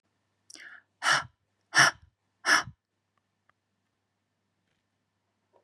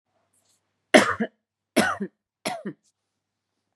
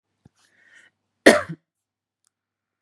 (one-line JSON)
{"exhalation_length": "5.6 s", "exhalation_amplitude": 16734, "exhalation_signal_mean_std_ratio": 0.24, "three_cough_length": "3.8 s", "three_cough_amplitude": 32470, "three_cough_signal_mean_std_ratio": 0.27, "cough_length": "2.8 s", "cough_amplitude": 32768, "cough_signal_mean_std_ratio": 0.17, "survey_phase": "beta (2021-08-13 to 2022-03-07)", "age": "18-44", "gender": "Female", "wearing_mask": "No", "symptom_none": true, "smoker_status": "Ex-smoker", "respiratory_condition_asthma": false, "respiratory_condition_other": false, "recruitment_source": "REACT", "submission_delay": "3 days", "covid_test_result": "Negative", "covid_test_method": "RT-qPCR", "influenza_a_test_result": "Negative", "influenza_b_test_result": "Negative"}